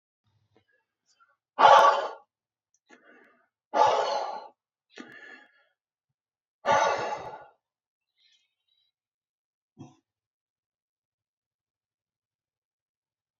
{"exhalation_length": "13.4 s", "exhalation_amplitude": 23251, "exhalation_signal_mean_std_ratio": 0.25, "survey_phase": "beta (2021-08-13 to 2022-03-07)", "age": "18-44", "gender": "Male", "wearing_mask": "No", "symptom_none": true, "smoker_status": "Never smoked", "respiratory_condition_asthma": false, "respiratory_condition_other": false, "recruitment_source": "REACT", "submission_delay": "1 day", "covid_test_result": "Negative", "covid_test_method": "RT-qPCR", "influenza_a_test_result": "Negative", "influenza_b_test_result": "Negative"}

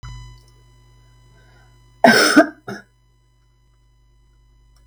{"cough_length": "4.9 s", "cough_amplitude": 32768, "cough_signal_mean_std_ratio": 0.26, "survey_phase": "beta (2021-08-13 to 2022-03-07)", "age": "65+", "gender": "Female", "wearing_mask": "No", "symptom_none": true, "smoker_status": "Never smoked", "respiratory_condition_asthma": false, "respiratory_condition_other": false, "recruitment_source": "REACT", "submission_delay": "2 days", "covid_test_result": "Negative", "covid_test_method": "RT-qPCR"}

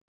{"exhalation_length": "0.1 s", "exhalation_amplitude": 22, "exhalation_signal_mean_std_ratio": 0.26, "survey_phase": "beta (2021-08-13 to 2022-03-07)", "age": "65+", "gender": "Male", "wearing_mask": "No", "symptom_none": true, "smoker_status": "Never smoked", "respiratory_condition_asthma": false, "respiratory_condition_other": false, "recruitment_source": "REACT", "submission_delay": "5 days", "covid_test_result": "Negative", "covid_test_method": "RT-qPCR", "influenza_a_test_result": "Negative", "influenza_b_test_result": "Negative"}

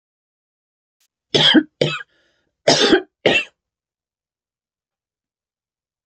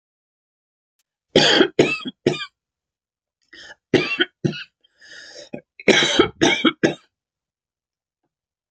{"cough_length": "6.1 s", "cough_amplitude": 29025, "cough_signal_mean_std_ratio": 0.3, "three_cough_length": "8.7 s", "three_cough_amplitude": 29974, "three_cough_signal_mean_std_ratio": 0.35, "survey_phase": "beta (2021-08-13 to 2022-03-07)", "age": "45-64", "gender": "Female", "wearing_mask": "No", "symptom_none": true, "smoker_status": "Never smoked", "respiratory_condition_asthma": false, "respiratory_condition_other": false, "recruitment_source": "REACT", "submission_delay": "1 day", "covid_test_result": "Negative", "covid_test_method": "RT-qPCR", "influenza_a_test_result": "Negative", "influenza_b_test_result": "Negative"}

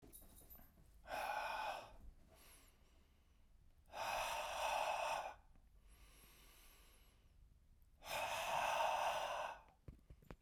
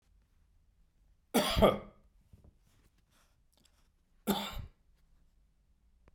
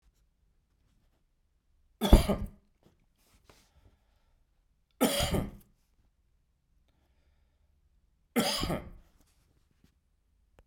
{"exhalation_length": "10.4 s", "exhalation_amplitude": 1345, "exhalation_signal_mean_std_ratio": 0.59, "cough_length": "6.1 s", "cough_amplitude": 8999, "cough_signal_mean_std_ratio": 0.26, "three_cough_length": "10.7 s", "three_cough_amplitude": 19947, "three_cough_signal_mean_std_ratio": 0.23, "survey_phase": "beta (2021-08-13 to 2022-03-07)", "age": "45-64", "gender": "Male", "wearing_mask": "No", "symptom_fatigue": true, "smoker_status": "Ex-smoker", "respiratory_condition_asthma": false, "respiratory_condition_other": false, "recruitment_source": "Test and Trace", "submission_delay": "2 days", "covid_test_result": "Positive", "covid_test_method": "RT-qPCR", "covid_ct_value": 38.6, "covid_ct_gene": "N gene"}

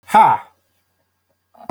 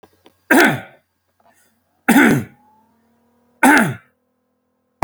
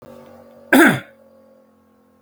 {"exhalation_length": "1.7 s", "exhalation_amplitude": 28262, "exhalation_signal_mean_std_ratio": 0.33, "three_cough_length": "5.0 s", "three_cough_amplitude": 32767, "three_cough_signal_mean_std_ratio": 0.36, "cough_length": "2.2 s", "cough_amplitude": 31335, "cough_signal_mean_std_ratio": 0.31, "survey_phase": "alpha (2021-03-01 to 2021-08-12)", "age": "45-64", "gender": "Male", "wearing_mask": "No", "symptom_none": true, "smoker_status": "Never smoked", "respiratory_condition_asthma": false, "respiratory_condition_other": false, "recruitment_source": "REACT", "submission_delay": "3 days", "covid_test_result": "Negative", "covid_test_method": "RT-qPCR"}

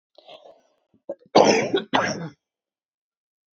{"cough_length": "3.6 s", "cough_amplitude": 27433, "cough_signal_mean_std_ratio": 0.33, "survey_phase": "alpha (2021-03-01 to 2021-08-12)", "age": "45-64", "gender": "Female", "wearing_mask": "No", "symptom_cough_any": true, "symptom_shortness_of_breath": true, "symptom_fatigue": true, "smoker_status": "Current smoker (11 or more cigarettes per day)", "respiratory_condition_asthma": true, "respiratory_condition_other": true, "recruitment_source": "REACT", "submission_delay": "2 days", "covid_test_result": "Negative", "covid_test_method": "RT-qPCR"}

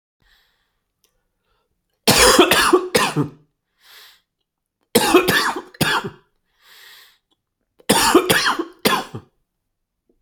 {"three_cough_length": "10.2 s", "three_cough_amplitude": 32768, "three_cough_signal_mean_std_ratio": 0.41, "survey_phase": "alpha (2021-03-01 to 2021-08-12)", "age": "18-44", "gender": "Male", "wearing_mask": "No", "symptom_none": true, "smoker_status": "Never smoked", "respiratory_condition_asthma": false, "respiratory_condition_other": false, "recruitment_source": "REACT", "submission_delay": "1 day", "covid_test_result": "Negative", "covid_test_method": "RT-qPCR"}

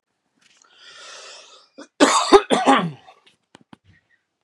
{"cough_length": "4.4 s", "cough_amplitude": 32767, "cough_signal_mean_std_ratio": 0.31, "survey_phase": "beta (2021-08-13 to 2022-03-07)", "age": "45-64", "gender": "Male", "wearing_mask": "No", "symptom_none": true, "smoker_status": "Current smoker (e-cigarettes or vapes only)", "respiratory_condition_asthma": false, "respiratory_condition_other": false, "recruitment_source": "REACT", "submission_delay": "2 days", "covid_test_result": "Negative", "covid_test_method": "RT-qPCR", "influenza_a_test_result": "Unknown/Void", "influenza_b_test_result": "Unknown/Void"}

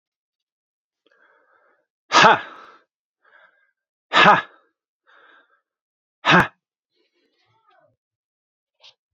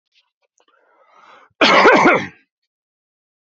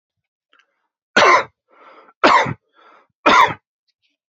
{"exhalation_length": "9.1 s", "exhalation_amplitude": 32253, "exhalation_signal_mean_std_ratio": 0.22, "cough_length": "3.4 s", "cough_amplitude": 32767, "cough_signal_mean_std_ratio": 0.36, "three_cough_length": "4.4 s", "three_cough_amplitude": 32524, "three_cough_signal_mean_std_ratio": 0.35, "survey_phase": "beta (2021-08-13 to 2022-03-07)", "age": "45-64", "gender": "Male", "wearing_mask": "No", "symptom_fatigue": true, "symptom_headache": true, "symptom_onset": "9 days", "smoker_status": "Never smoked", "respiratory_condition_asthma": false, "respiratory_condition_other": false, "recruitment_source": "Test and Trace", "submission_delay": "2 days", "covid_test_result": "Positive", "covid_test_method": "RT-qPCR", "covid_ct_value": 20.9, "covid_ct_gene": "ORF1ab gene", "covid_ct_mean": 21.4, "covid_viral_load": "95000 copies/ml", "covid_viral_load_category": "Low viral load (10K-1M copies/ml)"}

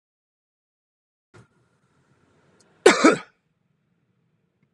{"cough_length": "4.7 s", "cough_amplitude": 32768, "cough_signal_mean_std_ratio": 0.18, "survey_phase": "alpha (2021-03-01 to 2021-08-12)", "age": "45-64", "gender": "Male", "wearing_mask": "No", "symptom_none": true, "smoker_status": "Current smoker (1 to 10 cigarettes per day)", "respiratory_condition_asthma": false, "respiratory_condition_other": false, "recruitment_source": "REACT", "submission_delay": "1 day", "covid_test_result": "Negative", "covid_test_method": "RT-qPCR"}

